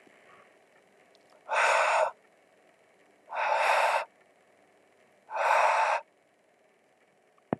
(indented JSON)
{
  "exhalation_length": "7.6 s",
  "exhalation_amplitude": 9747,
  "exhalation_signal_mean_std_ratio": 0.45,
  "survey_phase": "alpha (2021-03-01 to 2021-08-12)",
  "age": "18-44",
  "gender": "Male",
  "wearing_mask": "No",
  "symptom_cough_any": true,
  "symptom_fatigue": true,
  "symptom_fever_high_temperature": true,
  "symptom_headache": true,
  "symptom_change_to_sense_of_smell_or_taste": true,
  "symptom_loss_of_taste": true,
  "smoker_status": "Ex-smoker",
  "respiratory_condition_asthma": false,
  "respiratory_condition_other": false,
  "recruitment_source": "Test and Trace",
  "submission_delay": "2 days",
  "covid_test_result": "Positive",
  "covid_test_method": "RT-qPCR",
  "covid_ct_value": 28.9,
  "covid_ct_gene": "ORF1ab gene",
  "covid_ct_mean": 29.3,
  "covid_viral_load": "250 copies/ml",
  "covid_viral_load_category": "Minimal viral load (< 10K copies/ml)"
}